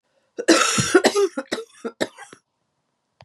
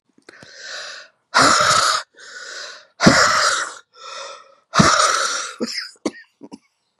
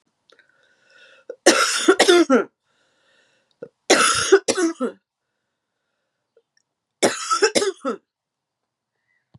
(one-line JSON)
{"cough_length": "3.2 s", "cough_amplitude": 30387, "cough_signal_mean_std_ratio": 0.42, "exhalation_length": "7.0 s", "exhalation_amplitude": 32768, "exhalation_signal_mean_std_ratio": 0.5, "three_cough_length": "9.4 s", "three_cough_amplitude": 32767, "three_cough_signal_mean_std_ratio": 0.37, "survey_phase": "beta (2021-08-13 to 2022-03-07)", "age": "45-64", "gender": "Female", "wearing_mask": "No", "symptom_cough_any": true, "symptom_runny_or_blocked_nose": true, "symptom_sore_throat": true, "symptom_fatigue": true, "symptom_headache": true, "symptom_change_to_sense_of_smell_or_taste": true, "symptom_loss_of_taste": true, "symptom_onset": "7 days", "smoker_status": "Never smoked", "respiratory_condition_asthma": true, "respiratory_condition_other": false, "recruitment_source": "Test and Trace", "submission_delay": "2 days", "covid_test_result": "Positive", "covid_test_method": "ePCR"}